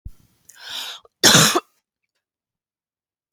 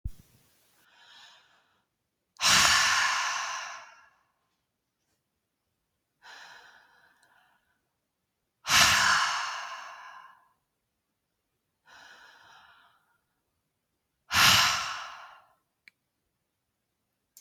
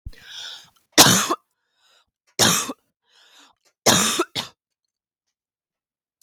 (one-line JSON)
{"cough_length": "3.3 s", "cough_amplitude": 32768, "cough_signal_mean_std_ratio": 0.29, "exhalation_length": "17.4 s", "exhalation_amplitude": 22365, "exhalation_signal_mean_std_ratio": 0.33, "three_cough_length": "6.2 s", "three_cough_amplitude": 32768, "three_cough_signal_mean_std_ratio": 0.32, "survey_phase": "beta (2021-08-13 to 2022-03-07)", "age": "18-44", "gender": "Female", "wearing_mask": "No", "symptom_fatigue": true, "symptom_headache": true, "smoker_status": "Never smoked", "respiratory_condition_asthma": false, "respiratory_condition_other": false, "recruitment_source": "REACT", "submission_delay": "0 days", "covid_test_result": "Negative", "covid_test_method": "RT-qPCR"}